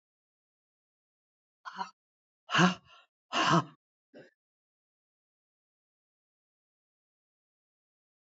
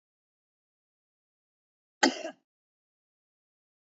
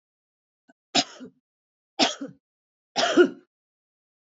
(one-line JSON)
{"exhalation_length": "8.3 s", "exhalation_amplitude": 7913, "exhalation_signal_mean_std_ratio": 0.21, "cough_length": "3.8 s", "cough_amplitude": 12377, "cough_signal_mean_std_ratio": 0.14, "three_cough_length": "4.4 s", "three_cough_amplitude": 18337, "three_cough_signal_mean_std_ratio": 0.27, "survey_phase": "beta (2021-08-13 to 2022-03-07)", "age": "65+", "gender": "Female", "wearing_mask": "No", "symptom_none": true, "smoker_status": "Current smoker (e-cigarettes or vapes only)", "respiratory_condition_asthma": false, "respiratory_condition_other": false, "recruitment_source": "REACT", "submission_delay": "3 days", "covid_test_result": "Negative", "covid_test_method": "RT-qPCR"}